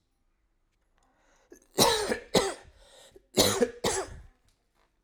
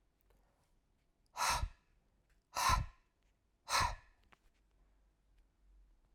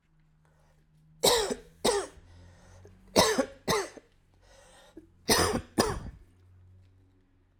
{"cough_length": "5.0 s", "cough_amplitude": 18633, "cough_signal_mean_std_ratio": 0.37, "exhalation_length": "6.1 s", "exhalation_amplitude": 3560, "exhalation_signal_mean_std_ratio": 0.32, "three_cough_length": "7.6 s", "three_cough_amplitude": 16493, "three_cough_signal_mean_std_ratio": 0.38, "survey_phase": "alpha (2021-03-01 to 2021-08-12)", "age": "45-64", "gender": "Male", "wearing_mask": "No", "symptom_cough_any": true, "symptom_fatigue": true, "symptom_change_to_sense_of_smell_or_taste": true, "symptom_loss_of_taste": true, "symptom_onset": "6 days", "smoker_status": "Never smoked", "respiratory_condition_asthma": false, "respiratory_condition_other": false, "recruitment_source": "Test and Trace", "submission_delay": "2 days", "covid_test_result": "Positive", "covid_test_method": "RT-qPCR", "covid_ct_value": 19.9, "covid_ct_gene": "ORF1ab gene"}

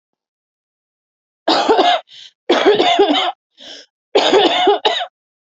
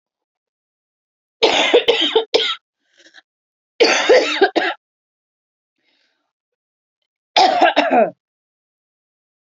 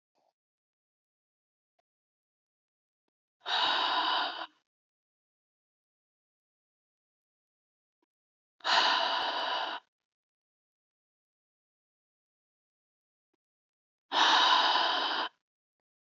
{"cough_length": "5.5 s", "cough_amplitude": 29162, "cough_signal_mean_std_ratio": 0.55, "three_cough_length": "9.5 s", "three_cough_amplitude": 32767, "three_cough_signal_mean_std_ratio": 0.4, "exhalation_length": "16.1 s", "exhalation_amplitude": 8215, "exhalation_signal_mean_std_ratio": 0.35, "survey_phase": "beta (2021-08-13 to 2022-03-07)", "age": "18-44", "gender": "Female", "wearing_mask": "No", "symptom_none": true, "smoker_status": "Never smoked", "respiratory_condition_asthma": false, "respiratory_condition_other": false, "recruitment_source": "REACT", "submission_delay": "2 days", "covid_test_result": "Negative", "covid_test_method": "RT-qPCR", "influenza_a_test_result": "Unknown/Void", "influenza_b_test_result": "Unknown/Void"}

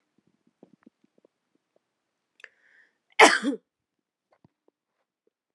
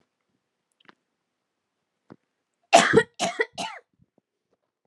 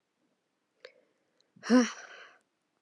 {"cough_length": "5.5 s", "cough_amplitude": 30440, "cough_signal_mean_std_ratio": 0.16, "three_cough_length": "4.9 s", "three_cough_amplitude": 26499, "three_cough_signal_mean_std_ratio": 0.23, "exhalation_length": "2.8 s", "exhalation_amplitude": 8358, "exhalation_signal_mean_std_ratio": 0.24, "survey_phase": "beta (2021-08-13 to 2022-03-07)", "age": "18-44", "gender": "Female", "wearing_mask": "No", "symptom_cough_any": true, "symptom_runny_or_blocked_nose": true, "symptom_shortness_of_breath": true, "symptom_sore_throat": true, "symptom_fatigue": true, "symptom_headache": true, "symptom_change_to_sense_of_smell_or_taste": true, "symptom_loss_of_taste": true, "symptom_other": true, "symptom_onset": "4 days", "smoker_status": "Never smoked", "respiratory_condition_asthma": false, "respiratory_condition_other": false, "recruitment_source": "Test and Trace", "submission_delay": "1 day", "covid_test_result": "Positive", "covid_test_method": "RT-qPCR", "covid_ct_value": 16.0, "covid_ct_gene": "ORF1ab gene", "covid_ct_mean": 16.4, "covid_viral_load": "4100000 copies/ml", "covid_viral_load_category": "High viral load (>1M copies/ml)"}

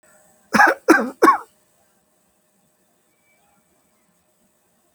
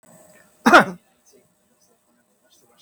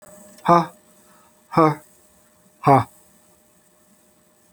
{"three_cough_length": "4.9 s", "three_cough_amplitude": 28859, "three_cough_signal_mean_std_ratio": 0.26, "cough_length": "2.8 s", "cough_amplitude": 32767, "cough_signal_mean_std_ratio": 0.21, "exhalation_length": "4.5 s", "exhalation_amplitude": 29097, "exhalation_signal_mean_std_ratio": 0.28, "survey_phase": "alpha (2021-03-01 to 2021-08-12)", "age": "45-64", "gender": "Male", "wearing_mask": "No", "symptom_none": true, "smoker_status": "Ex-smoker", "respiratory_condition_asthma": false, "respiratory_condition_other": false, "recruitment_source": "REACT", "submission_delay": "2 days", "covid_test_result": "Negative", "covid_test_method": "RT-qPCR"}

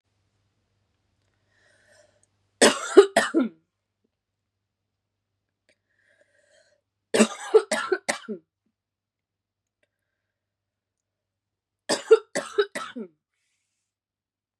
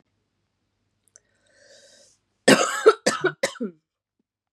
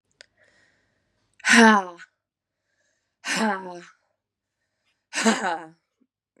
{"three_cough_length": "14.6 s", "three_cough_amplitude": 30417, "three_cough_signal_mean_std_ratio": 0.22, "cough_length": "4.5 s", "cough_amplitude": 29295, "cough_signal_mean_std_ratio": 0.27, "exhalation_length": "6.4 s", "exhalation_amplitude": 29889, "exhalation_signal_mean_std_ratio": 0.29, "survey_phase": "beta (2021-08-13 to 2022-03-07)", "age": "18-44", "gender": "Female", "wearing_mask": "No", "symptom_cough_any": true, "symptom_runny_or_blocked_nose": true, "symptom_sore_throat": true, "symptom_fatigue": true, "smoker_status": "Never smoked", "respiratory_condition_asthma": false, "respiratory_condition_other": false, "recruitment_source": "Test and Trace", "submission_delay": "1 day", "covid_test_result": "Positive", "covid_test_method": "RT-qPCR", "covid_ct_value": 17.5, "covid_ct_gene": "N gene"}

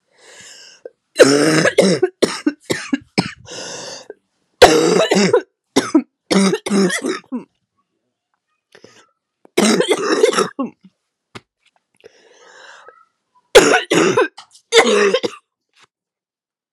{"cough_length": "16.7 s", "cough_amplitude": 32768, "cough_signal_mean_std_ratio": 0.44, "survey_phase": "alpha (2021-03-01 to 2021-08-12)", "age": "18-44", "gender": "Female", "wearing_mask": "No", "symptom_cough_any": true, "symptom_fatigue": true, "symptom_fever_high_temperature": true, "symptom_headache": true, "smoker_status": "Ex-smoker", "respiratory_condition_asthma": false, "respiratory_condition_other": false, "recruitment_source": "Test and Trace", "submission_delay": "1 day", "covid_test_result": "Positive", "covid_test_method": "RT-qPCR", "covid_ct_value": 12.3, "covid_ct_gene": "ORF1ab gene", "covid_ct_mean": 12.8, "covid_viral_load": "64000000 copies/ml", "covid_viral_load_category": "High viral load (>1M copies/ml)"}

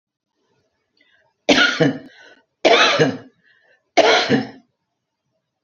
{"three_cough_length": "5.6 s", "three_cough_amplitude": 28047, "three_cough_signal_mean_std_ratio": 0.4, "survey_phase": "beta (2021-08-13 to 2022-03-07)", "age": "65+", "gender": "Female", "wearing_mask": "No", "symptom_none": true, "smoker_status": "Ex-smoker", "respiratory_condition_asthma": false, "respiratory_condition_other": false, "recruitment_source": "REACT", "submission_delay": "0 days", "covid_test_result": "Negative", "covid_test_method": "RT-qPCR", "influenza_a_test_result": "Negative", "influenza_b_test_result": "Negative"}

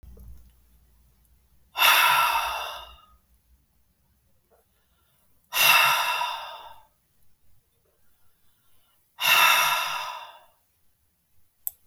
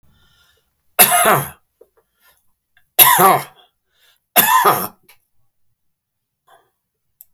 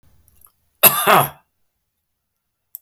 {"exhalation_length": "11.9 s", "exhalation_amplitude": 17535, "exhalation_signal_mean_std_ratio": 0.39, "three_cough_length": "7.3 s", "three_cough_amplitude": 32768, "three_cough_signal_mean_std_ratio": 0.34, "cough_length": "2.8 s", "cough_amplitude": 32768, "cough_signal_mean_std_ratio": 0.28, "survey_phase": "beta (2021-08-13 to 2022-03-07)", "age": "65+", "gender": "Male", "wearing_mask": "No", "symptom_none": true, "smoker_status": "Ex-smoker", "respiratory_condition_asthma": false, "respiratory_condition_other": false, "recruitment_source": "REACT", "submission_delay": "2 days", "covid_test_result": "Negative", "covid_test_method": "RT-qPCR"}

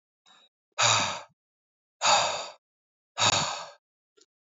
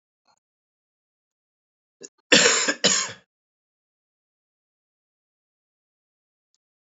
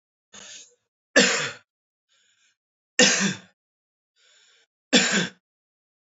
{"exhalation_length": "4.5 s", "exhalation_amplitude": 13021, "exhalation_signal_mean_std_ratio": 0.41, "cough_length": "6.8 s", "cough_amplitude": 25896, "cough_signal_mean_std_ratio": 0.23, "three_cough_length": "6.1 s", "three_cough_amplitude": 25958, "three_cough_signal_mean_std_ratio": 0.31, "survey_phase": "beta (2021-08-13 to 2022-03-07)", "age": "18-44", "gender": "Male", "wearing_mask": "No", "symptom_cough_any": true, "symptom_runny_or_blocked_nose": true, "symptom_shortness_of_breath": true, "symptom_fatigue": true, "symptom_fever_high_temperature": true, "symptom_headache": true, "symptom_change_to_sense_of_smell_or_taste": true, "symptom_onset": "2 days", "smoker_status": "Ex-smoker", "respiratory_condition_asthma": false, "respiratory_condition_other": false, "recruitment_source": "Test and Trace", "submission_delay": "1 day", "covid_test_result": "Positive", "covid_test_method": "RT-qPCR", "covid_ct_value": 20.4, "covid_ct_gene": "ORF1ab gene"}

